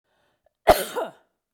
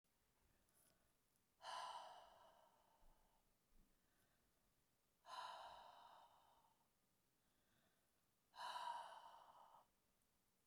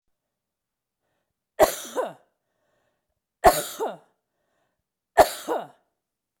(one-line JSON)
{"cough_length": "1.5 s", "cough_amplitude": 28464, "cough_signal_mean_std_ratio": 0.27, "exhalation_length": "10.7 s", "exhalation_amplitude": 324, "exhalation_signal_mean_std_ratio": 0.45, "three_cough_length": "6.4 s", "three_cough_amplitude": 29315, "three_cough_signal_mean_std_ratio": 0.24, "survey_phase": "beta (2021-08-13 to 2022-03-07)", "age": "65+", "gender": "Female", "wearing_mask": "No", "symptom_none": true, "smoker_status": "Never smoked", "respiratory_condition_asthma": false, "respiratory_condition_other": false, "recruitment_source": "REACT", "submission_delay": "23 days", "covid_test_result": "Negative", "covid_test_method": "RT-qPCR", "influenza_a_test_result": "Negative", "influenza_b_test_result": "Negative"}